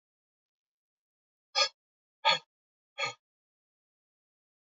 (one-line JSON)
{"exhalation_length": "4.6 s", "exhalation_amplitude": 8100, "exhalation_signal_mean_std_ratio": 0.21, "survey_phase": "beta (2021-08-13 to 2022-03-07)", "age": "45-64", "gender": "Male", "wearing_mask": "No", "symptom_cough_any": true, "smoker_status": "Never smoked", "respiratory_condition_asthma": false, "respiratory_condition_other": false, "recruitment_source": "Test and Trace", "submission_delay": "4 days", "covid_test_result": "Negative", "covid_test_method": "RT-qPCR"}